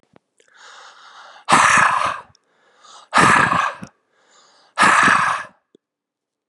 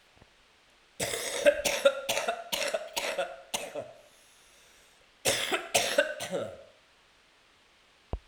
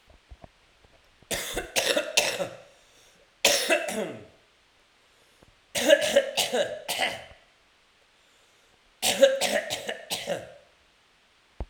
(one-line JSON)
{"exhalation_length": "6.5 s", "exhalation_amplitude": 32569, "exhalation_signal_mean_std_ratio": 0.45, "cough_length": "8.3 s", "cough_amplitude": 13710, "cough_signal_mean_std_ratio": 0.47, "three_cough_length": "11.7 s", "three_cough_amplitude": 27796, "three_cough_signal_mean_std_ratio": 0.43, "survey_phase": "alpha (2021-03-01 to 2021-08-12)", "age": "45-64", "gender": "Male", "wearing_mask": "No", "symptom_cough_any": true, "symptom_fatigue": true, "symptom_headache": true, "symptom_change_to_sense_of_smell_or_taste": true, "symptom_loss_of_taste": true, "symptom_onset": "3 days", "smoker_status": "Ex-smoker", "respiratory_condition_asthma": false, "respiratory_condition_other": false, "recruitment_source": "Test and Trace", "submission_delay": "2 days", "covid_test_result": "Positive", "covid_test_method": "RT-qPCR", "covid_ct_value": 20.8, "covid_ct_gene": "ORF1ab gene", "covid_ct_mean": 21.9, "covid_viral_load": "65000 copies/ml", "covid_viral_load_category": "Low viral load (10K-1M copies/ml)"}